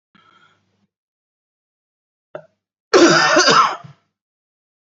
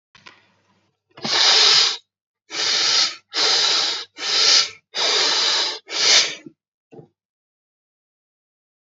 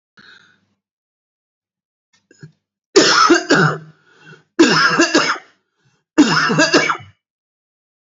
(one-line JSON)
{"cough_length": "4.9 s", "cough_amplitude": 29335, "cough_signal_mean_std_ratio": 0.33, "exhalation_length": "8.9 s", "exhalation_amplitude": 26894, "exhalation_signal_mean_std_ratio": 0.55, "three_cough_length": "8.1 s", "three_cough_amplitude": 32167, "three_cough_signal_mean_std_ratio": 0.43, "survey_phase": "beta (2021-08-13 to 2022-03-07)", "age": "45-64", "gender": "Male", "wearing_mask": "Yes", "symptom_none": true, "smoker_status": "Never smoked", "respiratory_condition_asthma": false, "respiratory_condition_other": false, "recruitment_source": "REACT", "submission_delay": "3 days", "covid_test_result": "Negative", "covid_test_method": "RT-qPCR", "influenza_a_test_result": "Negative", "influenza_b_test_result": "Negative"}